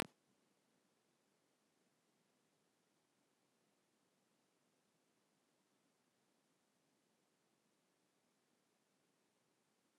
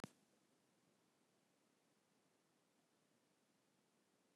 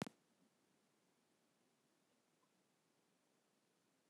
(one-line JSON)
{"three_cough_length": "10.0 s", "three_cough_amplitude": 4582, "three_cough_signal_mean_std_ratio": 0.12, "exhalation_length": "4.4 s", "exhalation_amplitude": 644, "exhalation_signal_mean_std_ratio": 0.3, "cough_length": "4.1 s", "cough_amplitude": 1423, "cough_signal_mean_std_ratio": 0.16, "survey_phase": "beta (2021-08-13 to 2022-03-07)", "age": "45-64", "gender": "Female", "wearing_mask": "No", "symptom_none": true, "smoker_status": "Ex-smoker", "respiratory_condition_asthma": false, "respiratory_condition_other": false, "recruitment_source": "REACT", "submission_delay": "4 days", "covid_test_result": "Negative", "covid_test_method": "RT-qPCR", "influenza_a_test_result": "Negative", "influenza_b_test_result": "Negative"}